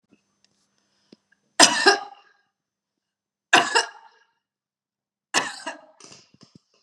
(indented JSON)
{
  "three_cough_length": "6.8 s",
  "three_cough_amplitude": 32768,
  "three_cough_signal_mean_std_ratio": 0.25,
  "survey_phase": "beta (2021-08-13 to 2022-03-07)",
  "age": "45-64",
  "gender": "Female",
  "wearing_mask": "No",
  "symptom_none": true,
  "smoker_status": "Never smoked",
  "respiratory_condition_asthma": false,
  "respiratory_condition_other": false,
  "recruitment_source": "REACT",
  "submission_delay": "1 day",
  "covid_test_result": "Negative",
  "covid_test_method": "RT-qPCR"
}